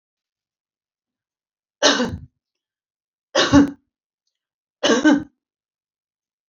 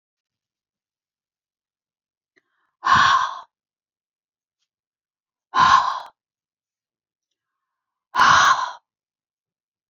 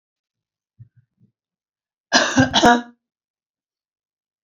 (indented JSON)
{
  "three_cough_length": "6.5 s",
  "three_cough_amplitude": 28653,
  "three_cough_signal_mean_std_ratio": 0.3,
  "exhalation_length": "9.9 s",
  "exhalation_amplitude": 23194,
  "exhalation_signal_mean_std_ratio": 0.3,
  "cough_length": "4.4 s",
  "cough_amplitude": 29975,
  "cough_signal_mean_std_ratio": 0.28,
  "survey_phase": "alpha (2021-03-01 to 2021-08-12)",
  "age": "45-64",
  "gender": "Female",
  "wearing_mask": "No",
  "symptom_none": true,
  "smoker_status": "Never smoked",
  "respiratory_condition_asthma": false,
  "respiratory_condition_other": false,
  "recruitment_source": "REACT",
  "submission_delay": "2 days",
  "covid_test_result": "Negative",
  "covid_test_method": "RT-qPCR"
}